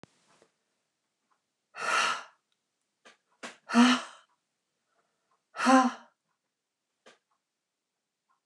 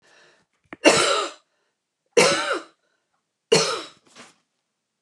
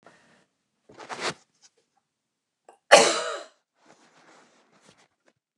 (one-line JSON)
{"exhalation_length": "8.5 s", "exhalation_amplitude": 13887, "exhalation_signal_mean_std_ratio": 0.26, "three_cough_length": "5.0 s", "three_cough_amplitude": 28427, "three_cough_signal_mean_std_ratio": 0.36, "cough_length": "5.6 s", "cough_amplitude": 29203, "cough_signal_mean_std_ratio": 0.2, "survey_phase": "alpha (2021-03-01 to 2021-08-12)", "age": "65+", "gender": "Female", "wearing_mask": "No", "symptom_none": true, "smoker_status": "Ex-smoker", "respiratory_condition_asthma": false, "respiratory_condition_other": false, "recruitment_source": "REACT", "submission_delay": "1 day", "covid_test_result": "Negative", "covid_test_method": "RT-qPCR"}